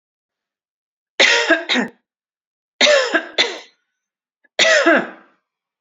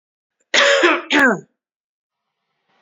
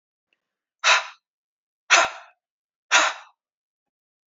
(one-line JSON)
{"three_cough_length": "5.8 s", "three_cough_amplitude": 32767, "three_cough_signal_mean_std_ratio": 0.42, "cough_length": "2.8 s", "cough_amplitude": 28839, "cough_signal_mean_std_ratio": 0.42, "exhalation_length": "4.4 s", "exhalation_amplitude": 25673, "exhalation_signal_mean_std_ratio": 0.28, "survey_phase": "beta (2021-08-13 to 2022-03-07)", "age": "45-64", "gender": "Female", "wearing_mask": "No", "symptom_cough_any": true, "symptom_onset": "10 days", "smoker_status": "Never smoked", "respiratory_condition_asthma": true, "respiratory_condition_other": false, "recruitment_source": "REACT", "submission_delay": "2 days", "covid_test_result": "Positive", "covid_test_method": "RT-qPCR", "covid_ct_value": 35.0, "covid_ct_gene": "E gene", "influenza_a_test_result": "Negative", "influenza_b_test_result": "Negative"}